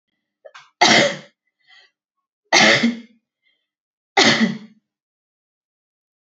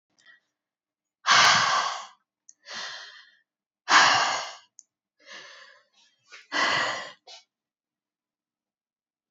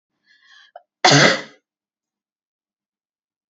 {"three_cough_length": "6.2 s", "three_cough_amplitude": 29050, "three_cough_signal_mean_std_ratio": 0.34, "exhalation_length": "9.3 s", "exhalation_amplitude": 18014, "exhalation_signal_mean_std_ratio": 0.35, "cough_length": "3.5 s", "cough_amplitude": 30526, "cough_signal_mean_std_ratio": 0.25, "survey_phase": "beta (2021-08-13 to 2022-03-07)", "age": "18-44", "gender": "Female", "wearing_mask": "No", "symptom_cough_any": true, "symptom_runny_or_blocked_nose": true, "symptom_sore_throat": true, "symptom_diarrhoea": true, "symptom_headache": true, "smoker_status": "Never smoked", "respiratory_condition_asthma": false, "respiratory_condition_other": false, "recruitment_source": "Test and Trace", "submission_delay": "2 days", "covid_test_result": "Positive", "covid_test_method": "LFT"}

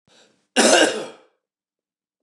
{"cough_length": "2.2 s", "cough_amplitude": 26107, "cough_signal_mean_std_ratio": 0.36, "survey_phase": "beta (2021-08-13 to 2022-03-07)", "age": "65+", "gender": "Male", "wearing_mask": "No", "symptom_cough_any": true, "symptom_runny_or_blocked_nose": true, "symptom_sore_throat": true, "symptom_headache": true, "smoker_status": "Ex-smoker", "respiratory_condition_asthma": false, "respiratory_condition_other": false, "recruitment_source": "REACT", "submission_delay": "2 days", "covid_test_result": "Negative", "covid_test_method": "RT-qPCR", "influenza_a_test_result": "Negative", "influenza_b_test_result": "Negative"}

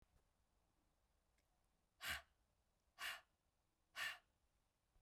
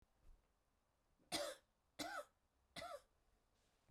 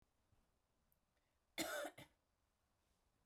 {"exhalation_length": "5.0 s", "exhalation_amplitude": 594, "exhalation_signal_mean_std_ratio": 0.3, "three_cough_length": "3.9 s", "three_cough_amplitude": 817, "three_cough_signal_mean_std_ratio": 0.37, "cough_length": "3.3 s", "cough_amplitude": 831, "cough_signal_mean_std_ratio": 0.29, "survey_phase": "beta (2021-08-13 to 2022-03-07)", "age": "45-64", "gender": "Female", "wearing_mask": "Yes", "symptom_headache": true, "smoker_status": "Never smoked", "respiratory_condition_asthma": false, "respiratory_condition_other": false, "recruitment_source": "Test and Trace", "submission_delay": "1 day", "covid_test_result": "Positive", "covid_test_method": "RT-qPCR", "covid_ct_value": 24.6, "covid_ct_gene": "ORF1ab gene", "covid_ct_mean": 25.0, "covid_viral_load": "6200 copies/ml", "covid_viral_load_category": "Minimal viral load (< 10K copies/ml)"}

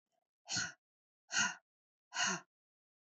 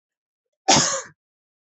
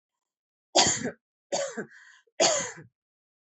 {"exhalation_length": "3.1 s", "exhalation_amplitude": 3190, "exhalation_signal_mean_std_ratio": 0.37, "cough_length": "1.8 s", "cough_amplitude": 26666, "cough_signal_mean_std_ratio": 0.32, "three_cough_length": "3.5 s", "three_cough_amplitude": 17243, "three_cough_signal_mean_std_ratio": 0.38, "survey_phase": "alpha (2021-03-01 to 2021-08-12)", "age": "45-64", "gender": "Female", "wearing_mask": "No", "symptom_none": true, "symptom_onset": "8 days", "smoker_status": "Never smoked", "respiratory_condition_asthma": false, "respiratory_condition_other": false, "recruitment_source": "REACT", "submission_delay": "3 days", "covid_test_result": "Negative", "covid_test_method": "RT-qPCR"}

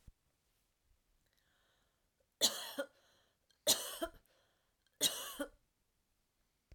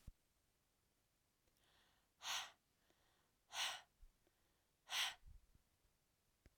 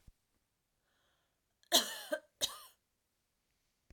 {"three_cough_length": "6.7 s", "three_cough_amplitude": 4310, "three_cough_signal_mean_std_ratio": 0.27, "exhalation_length": "6.6 s", "exhalation_amplitude": 997, "exhalation_signal_mean_std_ratio": 0.3, "cough_length": "3.9 s", "cough_amplitude": 7572, "cough_signal_mean_std_ratio": 0.22, "survey_phase": "alpha (2021-03-01 to 2021-08-12)", "age": "18-44", "gender": "Female", "wearing_mask": "No", "symptom_none": true, "symptom_onset": "12 days", "smoker_status": "Ex-smoker", "respiratory_condition_asthma": true, "respiratory_condition_other": false, "recruitment_source": "REACT", "submission_delay": "1 day", "covid_test_result": "Negative", "covid_test_method": "RT-qPCR"}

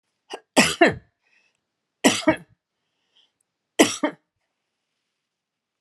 {"three_cough_length": "5.8 s", "three_cough_amplitude": 30741, "three_cough_signal_mean_std_ratio": 0.26, "survey_phase": "alpha (2021-03-01 to 2021-08-12)", "age": "65+", "gender": "Female", "wearing_mask": "No", "symptom_none": true, "smoker_status": "Ex-smoker", "respiratory_condition_asthma": false, "respiratory_condition_other": false, "recruitment_source": "REACT", "submission_delay": "3 days", "covid_test_result": "Negative", "covid_test_method": "RT-qPCR"}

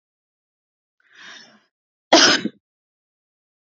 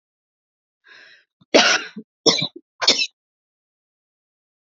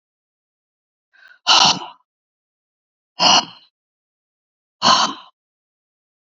{"cough_length": "3.7 s", "cough_amplitude": 30802, "cough_signal_mean_std_ratio": 0.23, "three_cough_length": "4.7 s", "three_cough_amplitude": 32768, "three_cough_signal_mean_std_ratio": 0.29, "exhalation_length": "6.3 s", "exhalation_amplitude": 31444, "exhalation_signal_mean_std_ratio": 0.29, "survey_phase": "beta (2021-08-13 to 2022-03-07)", "age": "18-44", "gender": "Female", "wearing_mask": "No", "symptom_cough_any": true, "symptom_new_continuous_cough": true, "symptom_runny_or_blocked_nose": true, "symptom_sore_throat": true, "symptom_fatigue": true, "symptom_headache": true, "symptom_onset": "2 days", "smoker_status": "Ex-smoker", "respiratory_condition_asthma": true, "respiratory_condition_other": false, "recruitment_source": "Test and Trace", "submission_delay": "1 day", "covid_test_result": "Positive", "covid_test_method": "RT-qPCR", "covid_ct_value": 26.4, "covid_ct_gene": "ORF1ab gene", "covid_ct_mean": 26.6, "covid_viral_load": "1900 copies/ml", "covid_viral_load_category": "Minimal viral load (< 10K copies/ml)"}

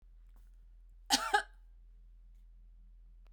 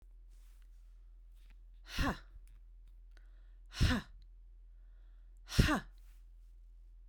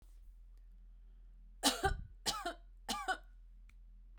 {"cough_length": "3.3 s", "cough_amplitude": 8032, "cough_signal_mean_std_ratio": 0.34, "exhalation_length": "7.1 s", "exhalation_amplitude": 7796, "exhalation_signal_mean_std_ratio": 0.38, "three_cough_length": "4.2 s", "three_cough_amplitude": 4763, "three_cough_signal_mean_std_ratio": 0.48, "survey_phase": "beta (2021-08-13 to 2022-03-07)", "age": "45-64", "gender": "Female", "wearing_mask": "No", "symptom_none": true, "smoker_status": "Ex-smoker", "respiratory_condition_asthma": false, "respiratory_condition_other": false, "recruitment_source": "REACT", "submission_delay": "8 days", "covid_test_result": "Negative", "covid_test_method": "RT-qPCR"}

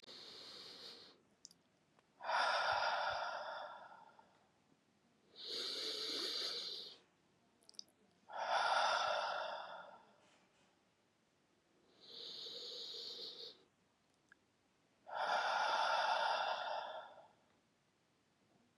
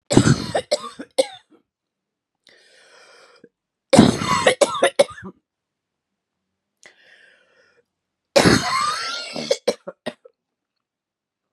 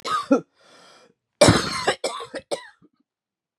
{"exhalation_length": "18.8 s", "exhalation_amplitude": 2161, "exhalation_signal_mean_std_ratio": 0.54, "three_cough_length": "11.5 s", "three_cough_amplitude": 32768, "three_cough_signal_mean_std_ratio": 0.33, "cough_length": "3.6 s", "cough_amplitude": 28276, "cough_signal_mean_std_ratio": 0.37, "survey_phase": "beta (2021-08-13 to 2022-03-07)", "age": "45-64", "gender": "Female", "wearing_mask": "No", "symptom_cough_any": true, "symptom_new_continuous_cough": true, "symptom_sore_throat": true, "symptom_fever_high_temperature": true, "symptom_headache": true, "smoker_status": "Ex-smoker", "respiratory_condition_asthma": false, "respiratory_condition_other": false, "recruitment_source": "Test and Trace", "submission_delay": "1 day", "covid_test_result": "Positive", "covid_test_method": "RT-qPCR", "covid_ct_value": 27.8, "covid_ct_gene": "N gene"}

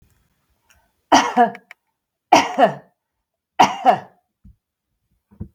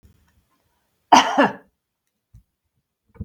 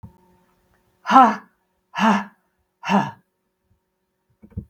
{"three_cough_length": "5.5 s", "three_cough_amplitude": 32766, "three_cough_signal_mean_std_ratio": 0.31, "cough_length": "3.2 s", "cough_amplitude": 32768, "cough_signal_mean_std_ratio": 0.24, "exhalation_length": "4.7 s", "exhalation_amplitude": 32766, "exhalation_signal_mean_std_ratio": 0.3, "survey_phase": "beta (2021-08-13 to 2022-03-07)", "age": "65+", "gender": "Female", "wearing_mask": "No", "symptom_none": true, "smoker_status": "Never smoked", "respiratory_condition_asthma": false, "respiratory_condition_other": false, "recruitment_source": "REACT", "submission_delay": "23 days", "covid_test_result": "Negative", "covid_test_method": "RT-qPCR"}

